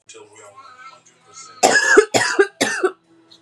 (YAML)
cough_length: 3.4 s
cough_amplitude: 32768
cough_signal_mean_std_ratio: 0.43
survey_phase: beta (2021-08-13 to 2022-03-07)
age: 18-44
gender: Female
wearing_mask: 'No'
symptom_cough_any: true
symptom_new_continuous_cough: true
symptom_runny_or_blocked_nose: true
symptom_shortness_of_breath: true
symptom_sore_throat: true
symptom_diarrhoea: true
symptom_fatigue: true
symptom_headache: true
symptom_change_to_sense_of_smell_or_taste: true
symptom_onset: 3 days
smoker_status: Never smoked
respiratory_condition_asthma: false
respiratory_condition_other: false
recruitment_source: Test and Trace
submission_delay: 1 day
covid_test_result: Positive
covid_test_method: RT-qPCR
covid_ct_value: 21.3
covid_ct_gene: ORF1ab gene